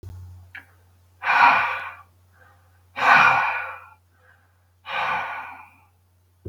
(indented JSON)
{
  "exhalation_length": "6.5 s",
  "exhalation_amplitude": 32766,
  "exhalation_signal_mean_std_ratio": 0.42,
  "survey_phase": "beta (2021-08-13 to 2022-03-07)",
  "age": "45-64",
  "gender": "Male",
  "wearing_mask": "No",
  "symptom_fatigue": true,
  "symptom_onset": "3 days",
  "smoker_status": "Never smoked",
  "respiratory_condition_asthma": true,
  "respiratory_condition_other": false,
  "recruitment_source": "Test and Trace",
  "submission_delay": "1 day",
  "covid_test_result": "Negative",
  "covid_test_method": "ePCR"
}